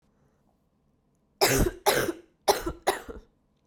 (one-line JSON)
{"cough_length": "3.7 s", "cough_amplitude": 17541, "cough_signal_mean_std_ratio": 0.39, "survey_phase": "beta (2021-08-13 to 2022-03-07)", "age": "18-44", "gender": "Female", "wearing_mask": "No", "symptom_cough_any": true, "symptom_runny_or_blocked_nose": true, "symptom_sore_throat": true, "symptom_fatigue": true, "symptom_headache": true, "symptom_other": true, "symptom_onset": "4 days", "smoker_status": "Never smoked", "respiratory_condition_asthma": false, "respiratory_condition_other": false, "recruitment_source": "Test and Trace", "submission_delay": "1 day", "covid_test_result": "Positive", "covid_test_method": "RT-qPCR", "covid_ct_value": 21.4, "covid_ct_gene": "ORF1ab gene", "covid_ct_mean": 22.2, "covid_viral_load": "53000 copies/ml", "covid_viral_load_category": "Low viral load (10K-1M copies/ml)"}